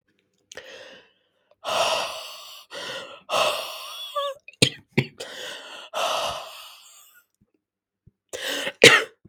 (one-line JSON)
{"exhalation_length": "9.3 s", "exhalation_amplitude": 32768, "exhalation_signal_mean_std_ratio": 0.37, "survey_phase": "beta (2021-08-13 to 2022-03-07)", "age": "18-44", "gender": "Female", "wearing_mask": "No", "symptom_cough_any": true, "symptom_new_continuous_cough": true, "symptom_sore_throat": true, "symptom_fatigue": true, "symptom_fever_high_temperature": true, "symptom_headache": true, "symptom_change_to_sense_of_smell_or_taste": true, "symptom_onset": "2 days", "smoker_status": "Never smoked", "respiratory_condition_asthma": true, "respiratory_condition_other": false, "recruitment_source": "Test and Trace", "submission_delay": "1 day", "covid_test_result": "Positive", "covid_test_method": "ePCR"}